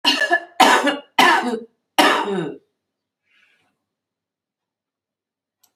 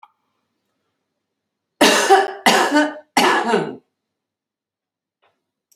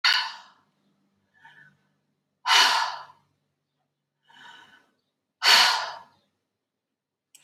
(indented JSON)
{
  "cough_length": "5.8 s",
  "cough_amplitude": 31097,
  "cough_signal_mean_std_ratio": 0.4,
  "three_cough_length": "5.8 s",
  "three_cough_amplitude": 30834,
  "three_cough_signal_mean_std_ratio": 0.4,
  "exhalation_length": "7.4 s",
  "exhalation_amplitude": 20730,
  "exhalation_signal_mean_std_ratio": 0.31,
  "survey_phase": "alpha (2021-03-01 to 2021-08-12)",
  "age": "65+",
  "gender": "Female",
  "wearing_mask": "No",
  "symptom_none": true,
  "smoker_status": "Never smoked",
  "respiratory_condition_asthma": false,
  "respiratory_condition_other": false,
  "recruitment_source": "REACT",
  "submission_delay": "2 days",
  "covid_test_result": "Negative",
  "covid_test_method": "RT-qPCR"
}